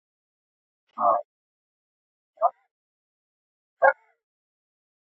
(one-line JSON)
{"exhalation_length": "5.0 s", "exhalation_amplitude": 19526, "exhalation_signal_mean_std_ratio": 0.21, "survey_phase": "alpha (2021-03-01 to 2021-08-12)", "age": "45-64", "gender": "Male", "wearing_mask": "No", "symptom_cough_any": true, "symptom_shortness_of_breath": true, "symptom_fatigue": true, "symptom_headache": true, "smoker_status": "Prefer not to say", "respiratory_condition_asthma": true, "respiratory_condition_other": false, "recruitment_source": "Test and Trace", "submission_delay": "2 days", "covid_test_result": "Positive", "covid_test_method": "RT-qPCR", "covid_ct_value": 11.1, "covid_ct_gene": "ORF1ab gene", "covid_ct_mean": 11.4, "covid_viral_load": "180000000 copies/ml", "covid_viral_load_category": "High viral load (>1M copies/ml)"}